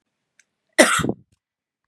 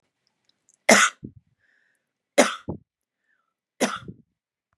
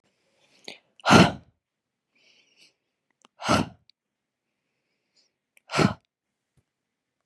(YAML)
cough_length: 1.9 s
cough_amplitude: 32768
cough_signal_mean_std_ratio: 0.28
three_cough_length: 4.8 s
three_cough_amplitude: 30264
three_cough_signal_mean_std_ratio: 0.24
exhalation_length: 7.3 s
exhalation_amplitude: 27642
exhalation_signal_mean_std_ratio: 0.21
survey_phase: beta (2021-08-13 to 2022-03-07)
age: 18-44
gender: Female
wearing_mask: 'No'
symptom_sore_throat: true
smoker_status: Never smoked
respiratory_condition_asthma: false
respiratory_condition_other: false
recruitment_source: REACT
submission_delay: 1 day
covid_test_result: Negative
covid_test_method: RT-qPCR
influenza_a_test_result: Negative
influenza_b_test_result: Negative